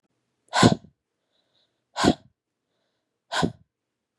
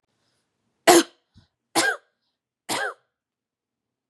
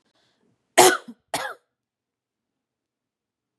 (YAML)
exhalation_length: 4.2 s
exhalation_amplitude: 28760
exhalation_signal_mean_std_ratio: 0.25
three_cough_length: 4.1 s
three_cough_amplitude: 30425
three_cough_signal_mean_std_ratio: 0.25
cough_length: 3.6 s
cough_amplitude: 32767
cough_signal_mean_std_ratio: 0.2
survey_phase: beta (2021-08-13 to 2022-03-07)
age: 18-44
gender: Female
wearing_mask: 'No'
symptom_none: true
smoker_status: Never smoked
respiratory_condition_asthma: false
respiratory_condition_other: false
recruitment_source: REACT
submission_delay: 2 days
covid_test_result: Negative
covid_test_method: RT-qPCR
influenza_a_test_result: Negative
influenza_b_test_result: Negative